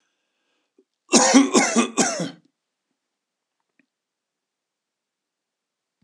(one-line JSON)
{"cough_length": "6.0 s", "cough_amplitude": 28837, "cough_signal_mean_std_ratio": 0.3, "survey_phase": "beta (2021-08-13 to 2022-03-07)", "age": "65+", "gender": "Male", "wearing_mask": "No", "symptom_none": true, "smoker_status": "Ex-smoker", "respiratory_condition_asthma": false, "respiratory_condition_other": false, "recruitment_source": "REACT", "submission_delay": "1 day", "covid_test_result": "Negative", "covid_test_method": "RT-qPCR"}